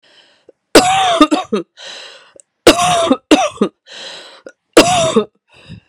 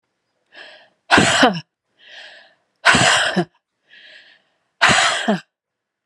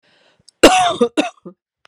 {
  "three_cough_length": "5.9 s",
  "three_cough_amplitude": 32768,
  "three_cough_signal_mean_std_ratio": 0.47,
  "exhalation_length": "6.1 s",
  "exhalation_amplitude": 32767,
  "exhalation_signal_mean_std_ratio": 0.42,
  "cough_length": "1.9 s",
  "cough_amplitude": 32768,
  "cough_signal_mean_std_ratio": 0.39,
  "survey_phase": "alpha (2021-03-01 to 2021-08-12)",
  "age": "45-64",
  "gender": "Female",
  "wearing_mask": "No",
  "symptom_cough_any": true,
  "symptom_shortness_of_breath": true,
  "symptom_fatigue": true,
  "symptom_fever_high_temperature": true,
  "symptom_headache": true,
  "symptom_change_to_sense_of_smell_or_taste": true,
  "smoker_status": "Ex-smoker",
  "respiratory_condition_asthma": true,
  "respiratory_condition_other": false,
  "recruitment_source": "Test and Trace",
  "submission_delay": "2 days",
  "covid_test_result": "Positive",
  "covid_test_method": "RT-qPCR",
  "covid_ct_value": 18.8,
  "covid_ct_gene": "ORF1ab gene",
  "covid_ct_mean": 19.9,
  "covid_viral_load": "310000 copies/ml",
  "covid_viral_load_category": "Low viral load (10K-1M copies/ml)"
}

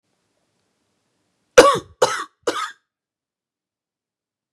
{
  "three_cough_length": "4.5 s",
  "three_cough_amplitude": 32768,
  "three_cough_signal_mean_std_ratio": 0.22,
  "survey_phase": "beta (2021-08-13 to 2022-03-07)",
  "age": "18-44",
  "gender": "Female",
  "wearing_mask": "No",
  "symptom_none": true,
  "smoker_status": "Never smoked",
  "respiratory_condition_asthma": true,
  "respiratory_condition_other": false,
  "recruitment_source": "REACT",
  "submission_delay": "1 day",
  "covid_test_result": "Negative",
  "covid_test_method": "RT-qPCR",
  "influenza_a_test_result": "Unknown/Void",
  "influenza_b_test_result": "Unknown/Void"
}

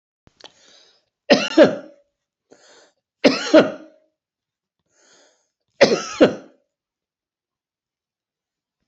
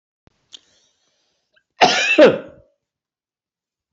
{
  "three_cough_length": "8.9 s",
  "three_cough_amplitude": 28306,
  "three_cough_signal_mean_std_ratio": 0.25,
  "cough_length": "3.9 s",
  "cough_amplitude": 29264,
  "cough_signal_mean_std_ratio": 0.28,
  "survey_phase": "beta (2021-08-13 to 2022-03-07)",
  "age": "65+",
  "gender": "Male",
  "wearing_mask": "No",
  "symptom_none": true,
  "smoker_status": "Ex-smoker",
  "respiratory_condition_asthma": true,
  "respiratory_condition_other": true,
  "recruitment_source": "REACT",
  "submission_delay": "1 day",
  "covid_test_result": "Negative",
  "covid_test_method": "RT-qPCR",
  "influenza_a_test_result": "Unknown/Void",
  "influenza_b_test_result": "Unknown/Void"
}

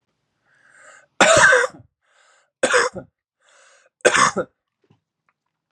{
  "three_cough_length": "5.7 s",
  "three_cough_amplitude": 31375,
  "three_cough_signal_mean_std_ratio": 0.34,
  "survey_phase": "beta (2021-08-13 to 2022-03-07)",
  "age": "18-44",
  "gender": "Male",
  "wearing_mask": "No",
  "symptom_none": true,
  "smoker_status": "Current smoker (1 to 10 cigarettes per day)",
  "respiratory_condition_asthma": false,
  "respiratory_condition_other": false,
  "recruitment_source": "REACT",
  "submission_delay": "1 day",
  "covid_test_result": "Negative",
  "covid_test_method": "RT-qPCR",
  "influenza_a_test_result": "Negative",
  "influenza_b_test_result": "Negative"
}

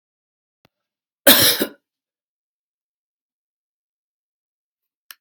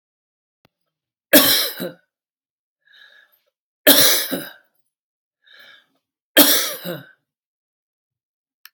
{
  "cough_length": "5.2 s",
  "cough_amplitude": 32768,
  "cough_signal_mean_std_ratio": 0.19,
  "three_cough_length": "8.7 s",
  "three_cough_amplitude": 32768,
  "three_cough_signal_mean_std_ratio": 0.29,
  "survey_phase": "alpha (2021-03-01 to 2021-08-12)",
  "age": "65+",
  "gender": "Male",
  "wearing_mask": "No",
  "symptom_none": true,
  "symptom_loss_of_taste": true,
  "smoker_status": "Never smoked",
  "respiratory_condition_asthma": false,
  "respiratory_condition_other": false,
  "recruitment_source": "REACT",
  "submission_delay": "6 days",
  "covid_test_result": "Negative",
  "covid_test_method": "RT-qPCR"
}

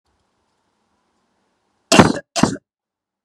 {
  "cough_length": "3.2 s",
  "cough_amplitude": 32768,
  "cough_signal_mean_std_ratio": 0.23,
  "survey_phase": "beta (2021-08-13 to 2022-03-07)",
  "age": "45-64",
  "gender": "Female",
  "wearing_mask": "No",
  "symptom_none": true,
  "smoker_status": "Never smoked",
  "respiratory_condition_asthma": false,
  "respiratory_condition_other": false,
  "recruitment_source": "REACT",
  "submission_delay": "1 day",
  "covid_test_result": "Negative",
  "covid_test_method": "RT-qPCR"
}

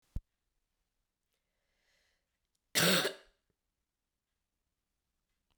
{
  "cough_length": "5.6 s",
  "cough_amplitude": 6264,
  "cough_signal_mean_std_ratio": 0.21,
  "survey_phase": "beta (2021-08-13 to 2022-03-07)",
  "age": "18-44",
  "gender": "Female",
  "wearing_mask": "No",
  "symptom_runny_or_blocked_nose": true,
  "symptom_change_to_sense_of_smell_or_taste": true,
  "symptom_other": true,
  "symptom_onset": "4 days",
  "smoker_status": "Never smoked",
  "respiratory_condition_asthma": false,
  "respiratory_condition_other": false,
  "recruitment_source": "Test and Trace",
  "submission_delay": "2 days",
  "covid_test_result": "Positive",
  "covid_test_method": "RT-qPCR",
  "covid_ct_value": 18.0,
  "covid_ct_gene": "ORF1ab gene",
  "covid_ct_mean": 18.8,
  "covid_viral_load": "680000 copies/ml",
  "covid_viral_load_category": "Low viral load (10K-1M copies/ml)"
}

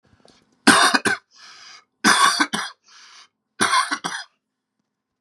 {
  "three_cough_length": "5.2 s",
  "three_cough_amplitude": 32304,
  "three_cough_signal_mean_std_ratio": 0.4,
  "survey_phase": "beta (2021-08-13 to 2022-03-07)",
  "age": "18-44",
  "gender": "Male",
  "wearing_mask": "No",
  "symptom_cough_any": true,
  "symptom_runny_or_blocked_nose": true,
  "symptom_sore_throat": true,
  "symptom_fatigue": true,
  "symptom_change_to_sense_of_smell_or_taste": true,
  "symptom_onset": "4 days",
  "smoker_status": "Never smoked",
  "respiratory_condition_asthma": false,
  "respiratory_condition_other": false,
  "recruitment_source": "Test and Trace",
  "submission_delay": "2 days",
  "covid_test_result": "Positive",
  "covid_test_method": "RT-qPCR",
  "covid_ct_value": 17.2,
  "covid_ct_gene": "N gene"
}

